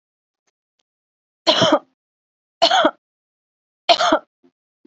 {
  "three_cough_length": "4.9 s",
  "three_cough_amplitude": 30285,
  "three_cough_signal_mean_std_ratio": 0.33,
  "survey_phase": "alpha (2021-03-01 to 2021-08-12)",
  "age": "18-44",
  "gender": "Female",
  "wearing_mask": "No",
  "symptom_cough_any": true,
  "symptom_headache": true,
  "symptom_change_to_sense_of_smell_or_taste": true,
  "symptom_onset": "4 days",
  "smoker_status": "Never smoked",
  "respiratory_condition_asthma": false,
  "respiratory_condition_other": false,
  "recruitment_source": "Test and Trace",
  "submission_delay": "2 days",
  "covid_test_result": "Positive",
  "covid_test_method": "RT-qPCR",
  "covid_ct_value": 13.9,
  "covid_ct_gene": "ORF1ab gene",
  "covid_ct_mean": 14.5,
  "covid_viral_load": "18000000 copies/ml",
  "covid_viral_load_category": "High viral load (>1M copies/ml)"
}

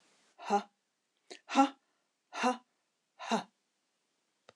{
  "exhalation_length": "4.6 s",
  "exhalation_amplitude": 7373,
  "exhalation_signal_mean_std_ratio": 0.28,
  "survey_phase": "beta (2021-08-13 to 2022-03-07)",
  "age": "65+",
  "gender": "Female",
  "wearing_mask": "No",
  "symptom_none": true,
  "smoker_status": "Never smoked",
  "respiratory_condition_asthma": false,
  "respiratory_condition_other": false,
  "recruitment_source": "REACT",
  "submission_delay": "1 day",
  "covid_test_result": "Negative",
  "covid_test_method": "RT-qPCR"
}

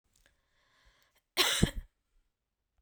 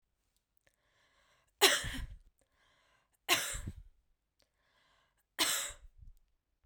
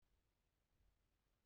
{
  "cough_length": "2.8 s",
  "cough_amplitude": 11361,
  "cough_signal_mean_std_ratio": 0.26,
  "three_cough_length": "6.7 s",
  "three_cough_amplitude": 12831,
  "three_cough_signal_mean_std_ratio": 0.29,
  "exhalation_length": "1.5 s",
  "exhalation_amplitude": 12,
  "exhalation_signal_mean_std_ratio": 0.91,
  "survey_phase": "beta (2021-08-13 to 2022-03-07)",
  "age": "18-44",
  "gender": "Female",
  "wearing_mask": "No",
  "symptom_none": true,
  "smoker_status": "Never smoked",
  "respiratory_condition_asthma": false,
  "respiratory_condition_other": false,
  "recruitment_source": "REACT",
  "submission_delay": "2 days",
  "covid_test_result": "Negative",
  "covid_test_method": "RT-qPCR",
  "influenza_a_test_result": "Unknown/Void",
  "influenza_b_test_result": "Unknown/Void"
}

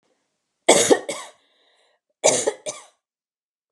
{
  "cough_length": "3.7 s",
  "cough_amplitude": 32237,
  "cough_signal_mean_std_ratio": 0.31,
  "survey_phase": "beta (2021-08-13 to 2022-03-07)",
  "age": "45-64",
  "gender": "Female",
  "wearing_mask": "No",
  "symptom_none": true,
  "smoker_status": "Never smoked",
  "respiratory_condition_asthma": false,
  "respiratory_condition_other": false,
  "recruitment_source": "REACT",
  "submission_delay": "3 days",
  "covid_test_result": "Negative",
  "covid_test_method": "RT-qPCR",
  "influenza_a_test_result": "Unknown/Void",
  "influenza_b_test_result": "Unknown/Void"
}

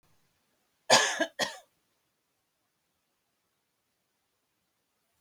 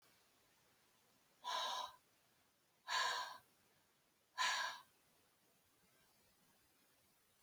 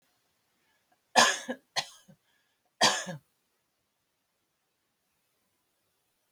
{
  "cough_length": "5.2 s",
  "cough_amplitude": 18387,
  "cough_signal_mean_std_ratio": 0.21,
  "exhalation_length": "7.4 s",
  "exhalation_amplitude": 1587,
  "exhalation_signal_mean_std_ratio": 0.37,
  "three_cough_length": "6.3 s",
  "three_cough_amplitude": 19832,
  "three_cough_signal_mean_std_ratio": 0.22,
  "survey_phase": "alpha (2021-03-01 to 2021-08-12)",
  "age": "65+",
  "gender": "Female",
  "wearing_mask": "No",
  "symptom_none": true,
  "smoker_status": "Never smoked",
  "respiratory_condition_asthma": false,
  "respiratory_condition_other": false,
  "recruitment_source": "REACT",
  "submission_delay": "2 days",
  "covid_test_result": "Negative",
  "covid_test_method": "RT-qPCR"
}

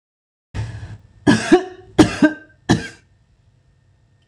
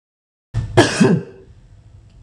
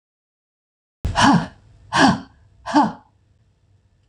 {
  "three_cough_length": "4.3 s",
  "three_cough_amplitude": 26028,
  "three_cough_signal_mean_std_ratio": 0.34,
  "cough_length": "2.2 s",
  "cough_amplitude": 26028,
  "cough_signal_mean_std_ratio": 0.41,
  "exhalation_length": "4.1 s",
  "exhalation_amplitude": 25968,
  "exhalation_signal_mean_std_ratio": 0.37,
  "survey_phase": "beta (2021-08-13 to 2022-03-07)",
  "age": "65+",
  "gender": "Female",
  "wearing_mask": "No",
  "symptom_none": true,
  "smoker_status": "Ex-smoker",
  "respiratory_condition_asthma": false,
  "respiratory_condition_other": false,
  "recruitment_source": "REACT",
  "submission_delay": "1 day",
  "covid_test_result": "Negative",
  "covid_test_method": "RT-qPCR"
}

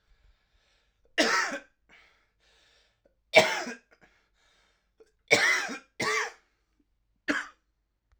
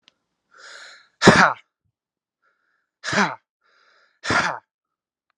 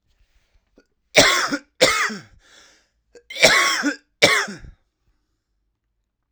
{
  "three_cough_length": "8.2 s",
  "three_cough_amplitude": 25080,
  "three_cough_signal_mean_std_ratio": 0.32,
  "exhalation_length": "5.4 s",
  "exhalation_amplitude": 32768,
  "exhalation_signal_mean_std_ratio": 0.27,
  "cough_length": "6.3 s",
  "cough_amplitude": 32768,
  "cough_signal_mean_std_ratio": 0.38,
  "survey_phase": "alpha (2021-03-01 to 2021-08-12)",
  "age": "18-44",
  "gender": "Male",
  "wearing_mask": "No",
  "symptom_cough_any": true,
  "symptom_new_continuous_cough": true,
  "symptom_shortness_of_breath": true,
  "symptom_diarrhoea": true,
  "symptom_headache": true,
  "symptom_change_to_sense_of_smell_or_taste": true,
  "symptom_onset": "3 days",
  "smoker_status": "Ex-smoker",
  "respiratory_condition_asthma": true,
  "respiratory_condition_other": false,
  "recruitment_source": "Test and Trace",
  "submission_delay": "1 day",
  "covid_test_result": "Positive",
  "covid_test_method": "RT-qPCR",
  "covid_ct_value": 15.5,
  "covid_ct_gene": "ORF1ab gene",
  "covid_ct_mean": 16.8,
  "covid_viral_load": "3000000 copies/ml",
  "covid_viral_load_category": "High viral load (>1M copies/ml)"
}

